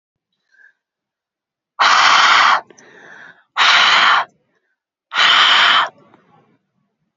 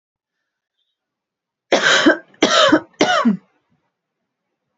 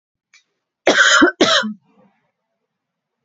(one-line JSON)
{"exhalation_length": "7.2 s", "exhalation_amplitude": 30956, "exhalation_signal_mean_std_ratio": 0.49, "three_cough_length": "4.8 s", "three_cough_amplitude": 32179, "three_cough_signal_mean_std_ratio": 0.4, "cough_length": "3.2 s", "cough_amplitude": 30622, "cough_signal_mean_std_ratio": 0.39, "survey_phase": "alpha (2021-03-01 to 2021-08-12)", "age": "18-44", "gender": "Female", "wearing_mask": "No", "symptom_cough_any": true, "symptom_fatigue": true, "symptom_headache": true, "symptom_onset": "4 days", "smoker_status": "Ex-smoker", "respiratory_condition_asthma": true, "respiratory_condition_other": false, "recruitment_source": "Test and Trace", "submission_delay": "1 day", "covid_test_result": "Positive", "covid_test_method": "RT-qPCR", "covid_ct_value": 17.2, "covid_ct_gene": "N gene", "covid_ct_mean": 18.0, "covid_viral_load": "1200000 copies/ml", "covid_viral_load_category": "High viral load (>1M copies/ml)"}